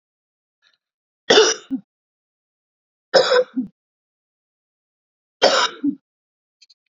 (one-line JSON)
{"three_cough_length": "6.9 s", "three_cough_amplitude": 30064, "three_cough_signal_mean_std_ratio": 0.3, "survey_phase": "beta (2021-08-13 to 2022-03-07)", "age": "45-64", "gender": "Female", "wearing_mask": "No", "symptom_runny_or_blocked_nose": true, "symptom_fatigue": true, "symptom_headache": true, "smoker_status": "Never smoked", "respiratory_condition_asthma": false, "respiratory_condition_other": false, "recruitment_source": "Test and Trace", "submission_delay": "2 days", "covid_test_result": "Positive", "covid_test_method": "RT-qPCR", "covid_ct_value": 22.0, "covid_ct_gene": "ORF1ab gene"}